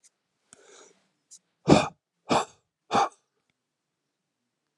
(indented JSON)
{
  "exhalation_length": "4.8 s",
  "exhalation_amplitude": 25629,
  "exhalation_signal_mean_std_ratio": 0.24,
  "survey_phase": "alpha (2021-03-01 to 2021-08-12)",
  "age": "45-64",
  "gender": "Male",
  "wearing_mask": "No",
  "symptom_cough_any": true,
  "symptom_shortness_of_breath": true,
  "symptom_onset": "6 days",
  "smoker_status": "Current smoker (e-cigarettes or vapes only)",
  "respiratory_condition_asthma": false,
  "respiratory_condition_other": true,
  "recruitment_source": "Test and Trace",
  "submission_delay": "2 days",
  "covid_test_result": "Positive",
  "covid_test_method": "RT-qPCR",
  "covid_ct_value": 38.1,
  "covid_ct_gene": "N gene"
}